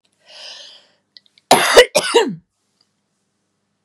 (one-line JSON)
{"cough_length": "3.8 s", "cough_amplitude": 32768, "cough_signal_mean_std_ratio": 0.31, "survey_phase": "beta (2021-08-13 to 2022-03-07)", "age": "45-64", "gender": "Female", "wearing_mask": "No", "symptom_none": true, "smoker_status": "Never smoked", "respiratory_condition_asthma": false, "respiratory_condition_other": false, "recruitment_source": "REACT", "submission_delay": "1 day", "covid_test_result": "Negative", "covid_test_method": "RT-qPCR", "influenza_a_test_result": "Negative", "influenza_b_test_result": "Negative"}